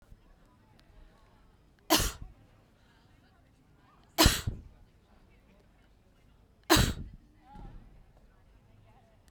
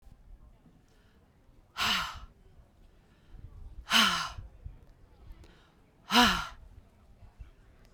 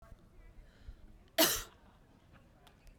{"three_cough_length": "9.3 s", "three_cough_amplitude": 14400, "three_cough_signal_mean_std_ratio": 0.25, "exhalation_length": "7.9 s", "exhalation_amplitude": 12446, "exhalation_signal_mean_std_ratio": 0.34, "cough_length": "3.0 s", "cough_amplitude": 7999, "cough_signal_mean_std_ratio": 0.29, "survey_phase": "beta (2021-08-13 to 2022-03-07)", "age": "45-64", "gender": "Female", "wearing_mask": "No", "symptom_none": true, "symptom_onset": "12 days", "smoker_status": "Ex-smoker", "respiratory_condition_asthma": false, "respiratory_condition_other": false, "recruitment_source": "REACT", "submission_delay": "5 days", "covid_test_result": "Negative", "covid_test_method": "RT-qPCR"}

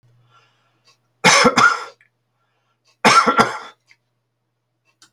{"cough_length": "5.1 s", "cough_amplitude": 32768, "cough_signal_mean_std_ratio": 0.35, "survey_phase": "beta (2021-08-13 to 2022-03-07)", "age": "65+", "gender": "Male", "wearing_mask": "No", "symptom_none": true, "smoker_status": "Never smoked", "respiratory_condition_asthma": false, "respiratory_condition_other": false, "recruitment_source": "REACT", "submission_delay": "8 days", "covid_test_result": "Negative", "covid_test_method": "RT-qPCR"}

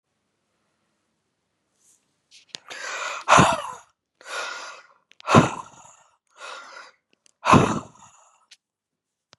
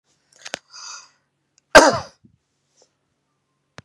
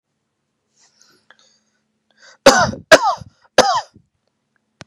{"exhalation_length": "9.4 s", "exhalation_amplitude": 32767, "exhalation_signal_mean_std_ratio": 0.28, "cough_length": "3.8 s", "cough_amplitude": 32768, "cough_signal_mean_std_ratio": 0.19, "three_cough_length": "4.9 s", "three_cough_amplitude": 32768, "three_cough_signal_mean_std_ratio": 0.27, "survey_phase": "beta (2021-08-13 to 2022-03-07)", "age": "45-64", "gender": "Male", "wearing_mask": "No", "symptom_none": true, "smoker_status": "Ex-smoker", "respiratory_condition_asthma": false, "respiratory_condition_other": false, "recruitment_source": "REACT", "submission_delay": "2 days", "covid_test_result": "Negative", "covid_test_method": "RT-qPCR", "influenza_a_test_result": "Negative", "influenza_b_test_result": "Negative"}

